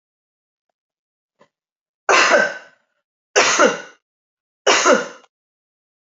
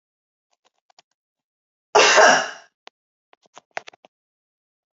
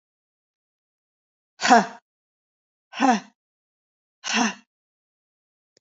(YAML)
three_cough_length: 6.1 s
three_cough_amplitude: 29986
three_cough_signal_mean_std_ratio: 0.36
cough_length: 4.9 s
cough_amplitude: 28732
cough_signal_mean_std_ratio: 0.26
exhalation_length: 5.8 s
exhalation_amplitude: 26385
exhalation_signal_mean_std_ratio: 0.25
survey_phase: alpha (2021-03-01 to 2021-08-12)
age: 18-44
gender: Female
wearing_mask: 'No'
symptom_cough_any: true
symptom_headache: true
smoker_status: Never smoked
respiratory_condition_asthma: false
respiratory_condition_other: false
recruitment_source: Test and Trace
submission_delay: 1 day
covid_test_result: Positive
covid_test_method: RT-qPCR
covid_ct_value: 21.1
covid_ct_gene: ORF1ab gene
covid_ct_mean: 21.7
covid_viral_load: 74000 copies/ml
covid_viral_load_category: Low viral load (10K-1M copies/ml)